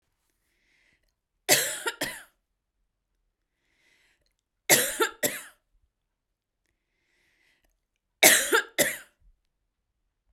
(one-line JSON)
{"three_cough_length": "10.3 s", "three_cough_amplitude": 28145, "three_cough_signal_mean_std_ratio": 0.26, "survey_phase": "beta (2021-08-13 to 2022-03-07)", "age": "18-44", "gender": "Female", "wearing_mask": "No", "symptom_cough_any": true, "symptom_sore_throat": true, "symptom_fatigue": true, "symptom_onset": "23 days", "smoker_status": "Never smoked", "respiratory_condition_asthma": true, "respiratory_condition_other": false, "recruitment_source": "Test and Trace", "submission_delay": "2 days", "covid_test_result": "Negative", "covid_test_method": "RT-qPCR"}